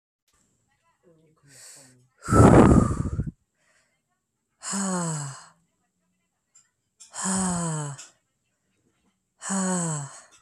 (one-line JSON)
{"exhalation_length": "10.4 s", "exhalation_amplitude": 24466, "exhalation_signal_mean_std_ratio": 0.35, "survey_phase": "beta (2021-08-13 to 2022-03-07)", "age": "18-44", "gender": "Male", "wearing_mask": "No", "symptom_none": true, "smoker_status": "Never smoked", "respiratory_condition_asthma": false, "respiratory_condition_other": false, "recruitment_source": "REACT", "submission_delay": "5 days", "covid_test_result": "Negative", "covid_test_method": "RT-qPCR", "influenza_a_test_result": "Negative", "influenza_b_test_result": "Negative"}